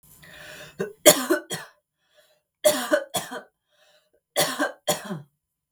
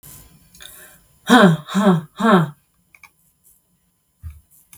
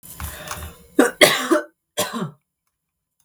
{"three_cough_length": "5.7 s", "three_cough_amplitude": 32768, "three_cough_signal_mean_std_ratio": 0.34, "exhalation_length": "4.8 s", "exhalation_amplitude": 32768, "exhalation_signal_mean_std_ratio": 0.35, "cough_length": "3.2 s", "cough_amplitude": 32768, "cough_signal_mean_std_ratio": 0.38, "survey_phase": "beta (2021-08-13 to 2022-03-07)", "age": "18-44", "gender": "Female", "wearing_mask": "No", "symptom_none": true, "smoker_status": "Never smoked", "respiratory_condition_asthma": false, "respiratory_condition_other": true, "recruitment_source": "REACT", "submission_delay": "2 days", "covid_test_result": "Negative", "covid_test_method": "RT-qPCR", "influenza_a_test_result": "Negative", "influenza_b_test_result": "Negative"}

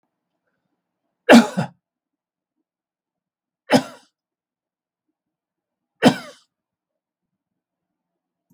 {"three_cough_length": "8.5 s", "three_cough_amplitude": 32768, "three_cough_signal_mean_std_ratio": 0.17, "survey_phase": "beta (2021-08-13 to 2022-03-07)", "age": "65+", "gender": "Male", "wearing_mask": "No", "symptom_none": true, "smoker_status": "Ex-smoker", "respiratory_condition_asthma": false, "respiratory_condition_other": false, "recruitment_source": "REACT", "submission_delay": "3 days", "covid_test_result": "Negative", "covid_test_method": "RT-qPCR", "influenza_a_test_result": "Unknown/Void", "influenza_b_test_result": "Unknown/Void"}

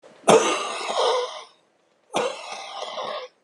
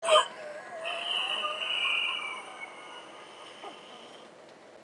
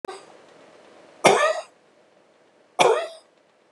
{"cough_length": "3.4 s", "cough_amplitude": 32481, "cough_signal_mean_std_ratio": 0.52, "exhalation_length": "4.8 s", "exhalation_amplitude": 11495, "exhalation_signal_mean_std_ratio": 0.59, "three_cough_length": "3.7 s", "three_cough_amplitude": 32261, "three_cough_signal_mean_std_ratio": 0.34, "survey_phase": "beta (2021-08-13 to 2022-03-07)", "age": "65+", "gender": "Male", "wearing_mask": "No", "symptom_cough_any": true, "symptom_shortness_of_breath": true, "smoker_status": "Current smoker (11 or more cigarettes per day)", "respiratory_condition_asthma": true, "respiratory_condition_other": false, "recruitment_source": "REACT", "submission_delay": "7 days", "covid_test_result": "Negative", "covid_test_method": "RT-qPCR", "influenza_a_test_result": "Unknown/Void", "influenza_b_test_result": "Unknown/Void"}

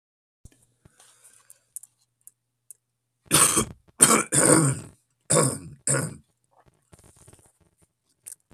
{"cough_length": "8.5 s", "cough_amplitude": 32768, "cough_signal_mean_std_ratio": 0.32, "survey_phase": "beta (2021-08-13 to 2022-03-07)", "age": "65+", "gender": "Male", "wearing_mask": "No", "symptom_cough_any": true, "symptom_runny_or_blocked_nose": true, "symptom_fatigue": true, "symptom_headache": true, "symptom_change_to_sense_of_smell_or_taste": true, "symptom_loss_of_taste": true, "smoker_status": "Never smoked", "respiratory_condition_asthma": false, "respiratory_condition_other": false, "recruitment_source": "Test and Trace", "submission_delay": "2 days", "covid_test_result": "Positive", "covid_test_method": "RT-qPCR", "covid_ct_value": 15.1, "covid_ct_gene": "ORF1ab gene", "covid_ct_mean": 15.3, "covid_viral_load": "9500000 copies/ml", "covid_viral_load_category": "High viral load (>1M copies/ml)"}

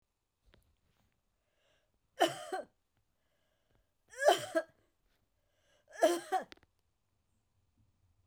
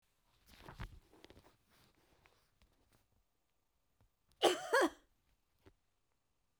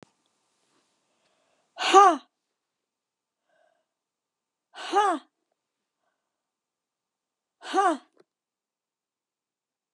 {"three_cough_length": "8.3 s", "three_cough_amplitude": 8228, "three_cough_signal_mean_std_ratio": 0.24, "cough_length": "6.6 s", "cough_amplitude": 5512, "cough_signal_mean_std_ratio": 0.22, "exhalation_length": "9.9 s", "exhalation_amplitude": 26399, "exhalation_signal_mean_std_ratio": 0.21, "survey_phase": "beta (2021-08-13 to 2022-03-07)", "age": "65+", "gender": "Female", "wearing_mask": "No", "symptom_none": true, "smoker_status": "Ex-smoker", "respiratory_condition_asthma": false, "respiratory_condition_other": false, "recruitment_source": "REACT", "submission_delay": "4 days", "covid_test_result": "Negative", "covid_test_method": "RT-qPCR"}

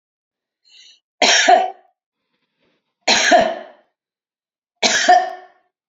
{"three_cough_length": "5.9 s", "three_cough_amplitude": 31057, "three_cough_signal_mean_std_ratio": 0.4, "survey_phase": "beta (2021-08-13 to 2022-03-07)", "age": "65+", "gender": "Female", "wearing_mask": "No", "symptom_none": true, "smoker_status": "Never smoked", "respiratory_condition_asthma": false, "respiratory_condition_other": false, "recruitment_source": "REACT", "submission_delay": "3 days", "covid_test_result": "Negative", "covid_test_method": "RT-qPCR", "influenza_a_test_result": "Negative", "influenza_b_test_result": "Negative"}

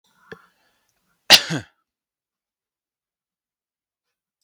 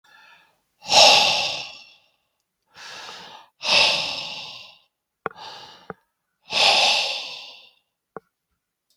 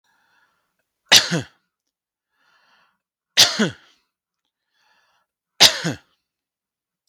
{"cough_length": "4.4 s", "cough_amplitude": 32768, "cough_signal_mean_std_ratio": 0.14, "exhalation_length": "9.0 s", "exhalation_amplitude": 32768, "exhalation_signal_mean_std_ratio": 0.39, "three_cough_length": "7.1 s", "three_cough_amplitude": 32768, "three_cough_signal_mean_std_ratio": 0.23, "survey_phase": "beta (2021-08-13 to 2022-03-07)", "age": "45-64", "gender": "Male", "wearing_mask": "No", "symptom_none": true, "smoker_status": "Never smoked", "respiratory_condition_asthma": false, "respiratory_condition_other": false, "recruitment_source": "REACT", "submission_delay": "1 day", "covid_test_result": "Negative", "covid_test_method": "RT-qPCR", "influenza_a_test_result": "Negative", "influenza_b_test_result": "Negative"}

